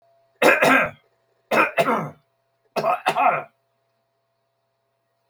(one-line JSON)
{"three_cough_length": "5.3 s", "three_cough_amplitude": 24448, "three_cough_signal_mean_std_ratio": 0.42, "survey_phase": "beta (2021-08-13 to 2022-03-07)", "age": "65+", "gender": "Male", "wearing_mask": "No", "symptom_none": true, "smoker_status": "Never smoked", "respiratory_condition_asthma": false, "respiratory_condition_other": false, "recruitment_source": "REACT", "submission_delay": "5 days", "covid_test_result": "Negative", "covid_test_method": "RT-qPCR"}